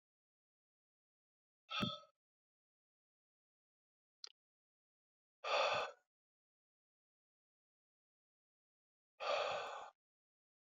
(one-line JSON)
{"exhalation_length": "10.7 s", "exhalation_amplitude": 1829, "exhalation_signal_mean_std_ratio": 0.27, "survey_phase": "beta (2021-08-13 to 2022-03-07)", "age": "65+", "gender": "Male", "wearing_mask": "No", "symptom_runny_or_blocked_nose": true, "symptom_headache": true, "symptom_onset": "8 days", "smoker_status": "Never smoked", "respiratory_condition_asthma": false, "respiratory_condition_other": false, "recruitment_source": "REACT", "submission_delay": "1 day", "covid_test_result": "Negative", "covid_test_method": "RT-qPCR"}